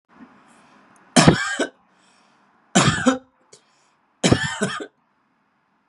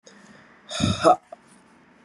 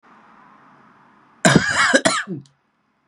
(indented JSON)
{
  "three_cough_length": "5.9 s",
  "three_cough_amplitude": 32768,
  "three_cough_signal_mean_std_ratio": 0.34,
  "exhalation_length": "2.0 s",
  "exhalation_amplitude": 24429,
  "exhalation_signal_mean_std_ratio": 0.34,
  "cough_length": "3.1 s",
  "cough_amplitude": 32767,
  "cough_signal_mean_std_ratio": 0.39,
  "survey_phase": "beta (2021-08-13 to 2022-03-07)",
  "age": "18-44",
  "gender": "Male",
  "wearing_mask": "No",
  "symptom_sore_throat": true,
  "symptom_headache": true,
  "symptom_onset": "80 days",
  "smoker_status": "Never smoked",
  "respiratory_condition_asthma": false,
  "respiratory_condition_other": false,
  "recruitment_source": "Test and Trace",
  "submission_delay": "0 days",
  "covid_test_method": "RT-qPCR",
  "covid_ct_value": 33.4,
  "covid_ct_gene": "ORF1ab gene",
  "covid_ct_mean": 34.4,
  "covid_viral_load": "5.3 copies/ml",
  "covid_viral_load_category": "Minimal viral load (< 10K copies/ml)"
}